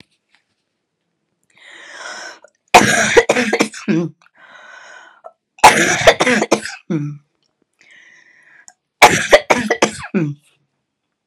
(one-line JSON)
{"three_cough_length": "11.3 s", "three_cough_amplitude": 32768, "three_cough_signal_mean_std_ratio": 0.38, "survey_phase": "alpha (2021-03-01 to 2021-08-12)", "age": "45-64", "gender": "Female", "wearing_mask": "No", "symptom_cough_any": true, "symptom_shortness_of_breath": true, "symptom_fatigue": true, "symptom_headache": true, "symptom_onset": "33 days", "smoker_status": "Never smoked", "respiratory_condition_asthma": true, "respiratory_condition_other": false, "recruitment_source": "Test and Trace", "submission_delay": "2 days", "covid_test_result": "Positive", "covid_test_method": "RT-qPCR"}